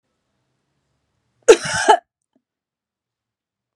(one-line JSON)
{"cough_length": "3.8 s", "cough_amplitude": 32768, "cough_signal_mean_std_ratio": 0.21, "survey_phase": "beta (2021-08-13 to 2022-03-07)", "age": "45-64", "gender": "Female", "wearing_mask": "No", "symptom_runny_or_blocked_nose": true, "smoker_status": "Never smoked", "respiratory_condition_asthma": false, "respiratory_condition_other": false, "recruitment_source": "REACT", "submission_delay": "2 days", "covid_test_result": "Negative", "covid_test_method": "RT-qPCR"}